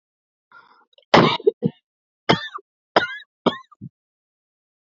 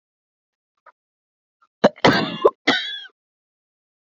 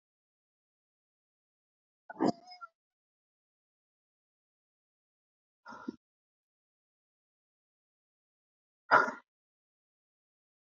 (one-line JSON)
{"three_cough_length": "4.9 s", "three_cough_amplitude": 29719, "three_cough_signal_mean_std_ratio": 0.27, "cough_length": "4.2 s", "cough_amplitude": 27463, "cough_signal_mean_std_ratio": 0.28, "exhalation_length": "10.7 s", "exhalation_amplitude": 8989, "exhalation_signal_mean_std_ratio": 0.14, "survey_phase": "beta (2021-08-13 to 2022-03-07)", "age": "18-44", "gender": "Female", "wearing_mask": "No", "symptom_cough_any": true, "symptom_runny_or_blocked_nose": true, "symptom_shortness_of_breath": true, "symptom_sore_throat": true, "symptom_fatigue": true, "symptom_fever_high_temperature": true, "symptom_headache": true, "smoker_status": "Current smoker (e-cigarettes or vapes only)", "respiratory_condition_asthma": true, "respiratory_condition_other": false, "recruitment_source": "Test and Trace", "submission_delay": "8 days", "covid_test_result": "Positive", "covid_test_method": "LFT"}